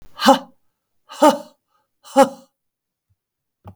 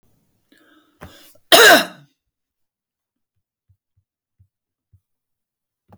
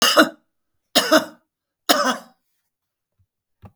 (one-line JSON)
{"exhalation_length": "3.8 s", "exhalation_amplitude": 32768, "exhalation_signal_mean_std_ratio": 0.26, "cough_length": "6.0 s", "cough_amplitude": 32768, "cough_signal_mean_std_ratio": 0.2, "three_cough_length": "3.8 s", "three_cough_amplitude": 32593, "three_cough_signal_mean_std_ratio": 0.34, "survey_phase": "beta (2021-08-13 to 2022-03-07)", "age": "45-64", "gender": "Female", "wearing_mask": "No", "symptom_none": true, "smoker_status": "Never smoked", "respiratory_condition_asthma": false, "respiratory_condition_other": false, "recruitment_source": "REACT", "submission_delay": "1 day", "covid_test_result": "Negative", "covid_test_method": "RT-qPCR"}